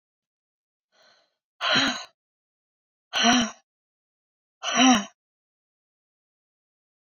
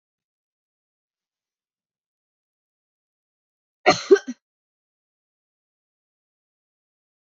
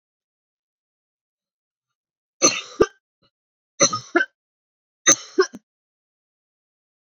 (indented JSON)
{
  "exhalation_length": "7.2 s",
  "exhalation_amplitude": 17387,
  "exhalation_signal_mean_std_ratio": 0.3,
  "cough_length": "7.3 s",
  "cough_amplitude": 31590,
  "cough_signal_mean_std_ratio": 0.12,
  "three_cough_length": "7.2 s",
  "three_cough_amplitude": 28583,
  "three_cough_signal_mean_std_ratio": 0.22,
  "survey_phase": "beta (2021-08-13 to 2022-03-07)",
  "age": "18-44",
  "gender": "Female",
  "wearing_mask": "No",
  "symptom_runny_or_blocked_nose": true,
  "symptom_sore_throat": true,
  "symptom_fatigue": true,
  "symptom_fever_high_temperature": true,
  "symptom_headache": true,
  "symptom_onset": "3 days",
  "smoker_status": "Never smoked",
  "respiratory_condition_asthma": false,
  "respiratory_condition_other": false,
  "recruitment_source": "Test and Trace",
  "submission_delay": "2 days",
  "covid_test_method": "RT-qPCR",
  "covid_ct_value": 33.5,
  "covid_ct_gene": "ORF1ab gene"
}